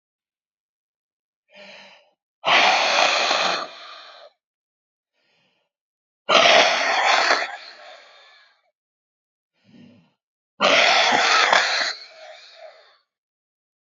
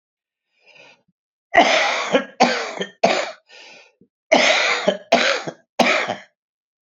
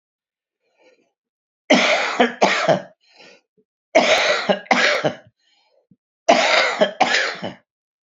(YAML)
exhalation_length: 13.8 s
exhalation_amplitude: 32767
exhalation_signal_mean_std_ratio: 0.44
cough_length: 6.8 s
cough_amplitude: 31671
cough_signal_mean_std_ratio: 0.49
three_cough_length: 8.0 s
three_cough_amplitude: 32768
three_cough_signal_mean_std_ratio: 0.49
survey_phase: beta (2021-08-13 to 2022-03-07)
age: 45-64
gender: Male
wearing_mask: 'No'
symptom_cough_any: true
symptom_runny_or_blocked_nose: true
symptom_sore_throat: true
symptom_fatigue: true
symptom_headache: true
symptom_change_to_sense_of_smell_or_taste: true
symptom_loss_of_taste: true
symptom_onset: 2 days
smoker_status: Ex-smoker
respiratory_condition_asthma: false
respiratory_condition_other: false
recruitment_source: Test and Trace
submission_delay: 0 days
covid_test_method: ePCR